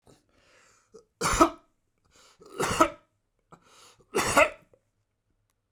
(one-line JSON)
{"three_cough_length": "5.7 s", "three_cough_amplitude": 20266, "three_cough_signal_mean_std_ratio": 0.29, "survey_phase": "beta (2021-08-13 to 2022-03-07)", "age": "45-64", "gender": "Male", "wearing_mask": "No", "symptom_none": true, "smoker_status": "Ex-smoker", "respiratory_condition_asthma": false, "respiratory_condition_other": false, "recruitment_source": "REACT", "submission_delay": "1 day", "covid_test_result": "Negative", "covid_test_method": "RT-qPCR"}